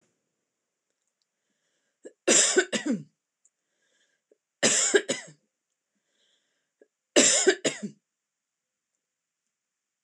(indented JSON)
{
  "three_cough_length": "10.0 s",
  "three_cough_amplitude": 22702,
  "three_cough_signal_mean_std_ratio": 0.3,
  "survey_phase": "beta (2021-08-13 to 2022-03-07)",
  "age": "45-64",
  "gender": "Female",
  "wearing_mask": "No",
  "symptom_none": true,
  "smoker_status": "Never smoked",
  "respiratory_condition_asthma": false,
  "respiratory_condition_other": false,
  "recruitment_source": "REACT",
  "submission_delay": "2 days",
  "covid_test_result": "Negative",
  "covid_test_method": "RT-qPCR",
  "influenza_a_test_result": "Negative",
  "influenza_b_test_result": "Negative"
}